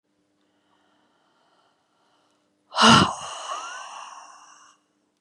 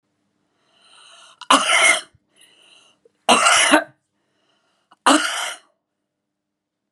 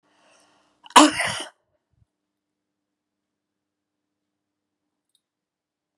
{"exhalation_length": "5.2 s", "exhalation_amplitude": 29394, "exhalation_signal_mean_std_ratio": 0.26, "three_cough_length": "6.9 s", "three_cough_amplitude": 32767, "three_cough_signal_mean_std_ratio": 0.36, "cough_length": "6.0 s", "cough_amplitude": 32767, "cough_signal_mean_std_ratio": 0.16, "survey_phase": "beta (2021-08-13 to 2022-03-07)", "age": "45-64", "gender": "Female", "wearing_mask": "No", "symptom_none": true, "smoker_status": "Ex-smoker", "respiratory_condition_asthma": true, "respiratory_condition_other": false, "recruitment_source": "REACT", "submission_delay": "2 days", "covid_test_result": "Negative", "covid_test_method": "RT-qPCR", "influenza_a_test_result": "Negative", "influenza_b_test_result": "Negative"}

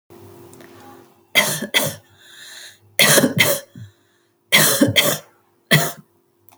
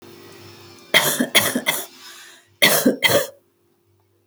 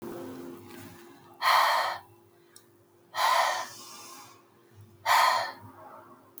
{"three_cough_length": "6.6 s", "three_cough_amplitude": 32768, "three_cough_signal_mean_std_ratio": 0.43, "cough_length": "4.3 s", "cough_amplitude": 32768, "cough_signal_mean_std_ratio": 0.45, "exhalation_length": "6.4 s", "exhalation_amplitude": 9914, "exhalation_signal_mean_std_ratio": 0.47, "survey_phase": "alpha (2021-03-01 to 2021-08-12)", "age": "18-44", "gender": "Female", "wearing_mask": "No", "symptom_none": true, "smoker_status": "Current smoker (11 or more cigarettes per day)", "respiratory_condition_asthma": false, "respiratory_condition_other": false, "recruitment_source": "REACT", "submission_delay": "1 day", "covid_test_result": "Negative", "covid_test_method": "RT-qPCR"}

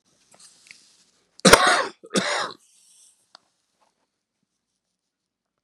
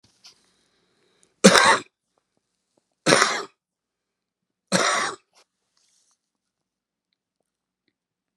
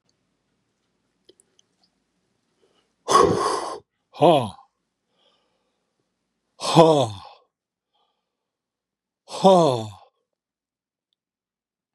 {"cough_length": "5.6 s", "cough_amplitude": 32768, "cough_signal_mean_std_ratio": 0.24, "three_cough_length": "8.4 s", "three_cough_amplitude": 32768, "three_cough_signal_mean_std_ratio": 0.25, "exhalation_length": "11.9 s", "exhalation_amplitude": 32640, "exhalation_signal_mean_std_ratio": 0.28, "survey_phase": "beta (2021-08-13 to 2022-03-07)", "age": "65+", "gender": "Male", "wearing_mask": "No", "symptom_cough_any": true, "symptom_runny_or_blocked_nose": true, "symptom_onset": "12 days", "smoker_status": "Ex-smoker", "respiratory_condition_asthma": false, "respiratory_condition_other": false, "recruitment_source": "REACT", "submission_delay": "2 days", "covid_test_result": "Negative", "covid_test_method": "RT-qPCR", "influenza_a_test_result": "Negative", "influenza_b_test_result": "Negative"}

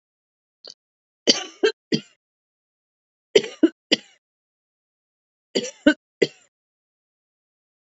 {"three_cough_length": "7.9 s", "three_cough_amplitude": 32114, "three_cough_signal_mean_std_ratio": 0.2, "survey_phase": "alpha (2021-03-01 to 2021-08-12)", "age": "45-64", "gender": "Female", "wearing_mask": "No", "symptom_none": true, "smoker_status": "Ex-smoker", "respiratory_condition_asthma": false, "respiratory_condition_other": false, "recruitment_source": "REACT", "submission_delay": "1 day", "covid_test_result": "Negative", "covid_test_method": "RT-qPCR"}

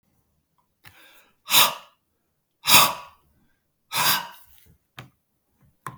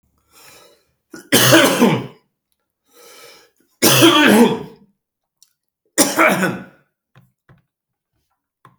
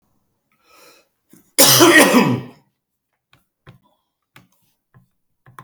{"exhalation_length": "6.0 s", "exhalation_amplitude": 32766, "exhalation_signal_mean_std_ratio": 0.28, "three_cough_length": "8.8 s", "three_cough_amplitude": 32768, "three_cough_signal_mean_std_ratio": 0.39, "cough_length": "5.6 s", "cough_amplitude": 32768, "cough_signal_mean_std_ratio": 0.31, "survey_phase": "beta (2021-08-13 to 2022-03-07)", "age": "65+", "gender": "Male", "wearing_mask": "No", "symptom_cough_any": true, "smoker_status": "Never smoked", "respiratory_condition_asthma": false, "respiratory_condition_other": false, "recruitment_source": "REACT", "submission_delay": "1 day", "covid_test_result": "Negative", "covid_test_method": "RT-qPCR", "influenza_a_test_result": "Negative", "influenza_b_test_result": "Negative"}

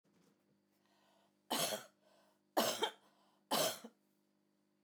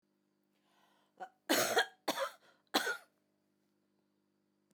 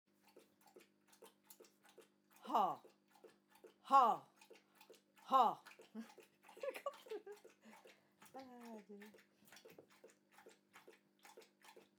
{"three_cough_length": "4.8 s", "three_cough_amplitude": 3307, "three_cough_signal_mean_std_ratio": 0.35, "cough_length": "4.7 s", "cough_amplitude": 5529, "cough_signal_mean_std_ratio": 0.32, "exhalation_length": "12.0 s", "exhalation_amplitude": 3123, "exhalation_signal_mean_std_ratio": 0.26, "survey_phase": "beta (2021-08-13 to 2022-03-07)", "age": "45-64", "gender": "Female", "wearing_mask": "No", "symptom_sore_throat": true, "smoker_status": "Never smoked", "respiratory_condition_asthma": false, "respiratory_condition_other": false, "recruitment_source": "REACT", "submission_delay": "2 days", "covid_test_result": "Negative", "covid_test_method": "RT-qPCR"}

